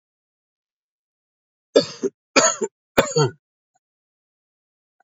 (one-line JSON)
{"three_cough_length": "5.0 s", "three_cough_amplitude": 28532, "three_cough_signal_mean_std_ratio": 0.26, "survey_phase": "beta (2021-08-13 to 2022-03-07)", "age": "45-64", "gender": "Male", "wearing_mask": "No", "symptom_cough_any": true, "smoker_status": "Never smoked", "respiratory_condition_asthma": false, "respiratory_condition_other": false, "recruitment_source": "Test and Trace", "submission_delay": "4 days", "covid_test_result": "Negative", "covid_test_method": "RT-qPCR"}